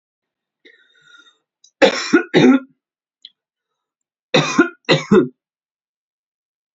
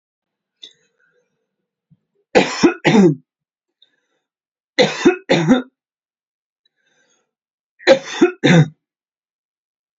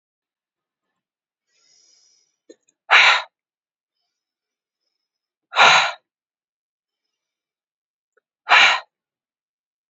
{"cough_length": "6.7 s", "cough_amplitude": 32767, "cough_signal_mean_std_ratio": 0.32, "three_cough_length": "10.0 s", "three_cough_amplitude": 32768, "three_cough_signal_mean_std_ratio": 0.32, "exhalation_length": "9.9 s", "exhalation_amplitude": 29559, "exhalation_signal_mean_std_ratio": 0.24, "survey_phase": "beta (2021-08-13 to 2022-03-07)", "age": "18-44", "gender": "Female", "wearing_mask": "No", "symptom_change_to_sense_of_smell_or_taste": true, "symptom_onset": "3 days", "smoker_status": "Never smoked", "respiratory_condition_asthma": true, "respiratory_condition_other": false, "recruitment_source": "Test and Trace", "submission_delay": "2 days", "covid_test_result": "Positive", "covid_test_method": "RT-qPCR"}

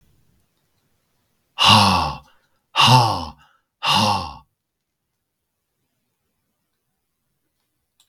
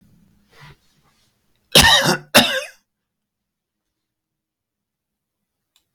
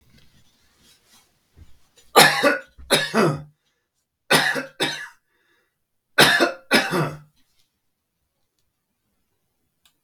{"exhalation_length": "8.1 s", "exhalation_amplitude": 32768, "exhalation_signal_mean_std_ratio": 0.33, "cough_length": "5.9 s", "cough_amplitude": 32768, "cough_signal_mean_std_ratio": 0.26, "three_cough_length": "10.0 s", "three_cough_amplitude": 32767, "three_cough_signal_mean_std_ratio": 0.34, "survey_phase": "beta (2021-08-13 to 2022-03-07)", "age": "65+", "gender": "Male", "wearing_mask": "No", "symptom_none": true, "smoker_status": "Never smoked", "respiratory_condition_asthma": false, "respiratory_condition_other": false, "recruitment_source": "REACT", "submission_delay": "3 days", "covid_test_result": "Negative", "covid_test_method": "RT-qPCR", "influenza_a_test_result": "Unknown/Void", "influenza_b_test_result": "Unknown/Void"}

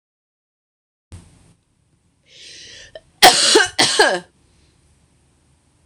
{"cough_length": "5.9 s", "cough_amplitude": 26028, "cough_signal_mean_std_ratio": 0.3, "survey_phase": "beta (2021-08-13 to 2022-03-07)", "age": "18-44", "gender": "Female", "wearing_mask": "No", "symptom_cough_any": true, "symptom_runny_or_blocked_nose": true, "symptom_sore_throat": true, "symptom_fatigue": true, "symptom_headache": true, "symptom_other": true, "smoker_status": "Ex-smoker", "respiratory_condition_asthma": false, "respiratory_condition_other": false, "recruitment_source": "Test and Trace", "submission_delay": "2 days", "covid_test_result": "Positive", "covid_test_method": "RT-qPCR", "covid_ct_value": 32.7, "covid_ct_gene": "ORF1ab gene"}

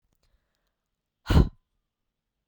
{"exhalation_length": "2.5 s", "exhalation_amplitude": 17014, "exhalation_signal_mean_std_ratio": 0.21, "survey_phase": "beta (2021-08-13 to 2022-03-07)", "age": "18-44", "gender": "Female", "wearing_mask": "No", "symptom_runny_or_blocked_nose": true, "symptom_sore_throat": true, "symptom_headache": true, "smoker_status": "Never smoked", "respiratory_condition_asthma": false, "respiratory_condition_other": false, "recruitment_source": "Test and Trace", "submission_delay": "2 days", "covid_test_result": "Positive", "covid_test_method": "RT-qPCR", "covid_ct_value": 31.7, "covid_ct_gene": "ORF1ab gene"}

